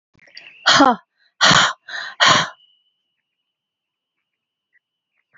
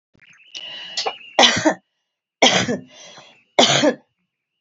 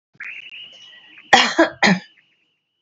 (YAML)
exhalation_length: 5.4 s
exhalation_amplitude: 32268
exhalation_signal_mean_std_ratio: 0.33
three_cough_length: 4.6 s
three_cough_amplitude: 32768
three_cough_signal_mean_std_ratio: 0.41
cough_length: 2.8 s
cough_amplitude: 29378
cough_signal_mean_std_ratio: 0.35
survey_phase: beta (2021-08-13 to 2022-03-07)
age: 65+
gender: Female
wearing_mask: 'No'
symptom_cough_any: true
symptom_runny_or_blocked_nose: true
symptom_onset: 8 days
smoker_status: Never smoked
respiratory_condition_asthma: false
respiratory_condition_other: true
recruitment_source: Test and Trace
submission_delay: 2 days
covid_test_result: Negative
covid_test_method: LAMP